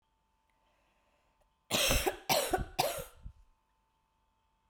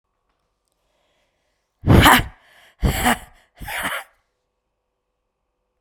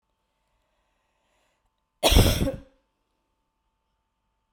{"three_cough_length": "4.7 s", "three_cough_amplitude": 6865, "three_cough_signal_mean_std_ratio": 0.38, "exhalation_length": "5.8 s", "exhalation_amplitude": 32768, "exhalation_signal_mean_std_ratio": 0.29, "cough_length": "4.5 s", "cough_amplitude": 23071, "cough_signal_mean_std_ratio": 0.24, "survey_phase": "beta (2021-08-13 to 2022-03-07)", "age": "18-44", "gender": "Female", "wearing_mask": "No", "symptom_cough_any": true, "symptom_shortness_of_breath": true, "symptom_sore_throat": true, "symptom_onset": "3 days", "smoker_status": "Never smoked", "respiratory_condition_asthma": true, "respiratory_condition_other": false, "recruitment_source": "Test and Trace", "submission_delay": "2 days", "covid_test_result": "Negative", "covid_test_method": "RT-qPCR"}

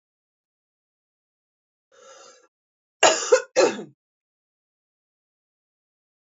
{"cough_length": "6.2 s", "cough_amplitude": 27347, "cough_signal_mean_std_ratio": 0.22, "survey_phase": "beta (2021-08-13 to 2022-03-07)", "age": "45-64", "gender": "Female", "wearing_mask": "No", "symptom_new_continuous_cough": true, "symptom_runny_or_blocked_nose": true, "symptom_sore_throat": true, "symptom_fatigue": true, "symptom_headache": true, "smoker_status": "Never smoked", "respiratory_condition_asthma": false, "respiratory_condition_other": false, "recruitment_source": "Test and Trace", "submission_delay": "2 days", "covid_test_result": "Positive", "covid_test_method": "LFT"}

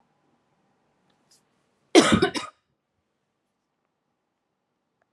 {"cough_length": "5.1 s", "cough_amplitude": 29548, "cough_signal_mean_std_ratio": 0.2, "survey_phase": "alpha (2021-03-01 to 2021-08-12)", "age": "18-44", "gender": "Female", "wearing_mask": "Yes", "symptom_none": true, "smoker_status": "Never smoked", "respiratory_condition_asthma": false, "respiratory_condition_other": false, "recruitment_source": "Test and Trace", "submission_delay": "0 days", "covid_test_result": "Negative", "covid_test_method": "LFT"}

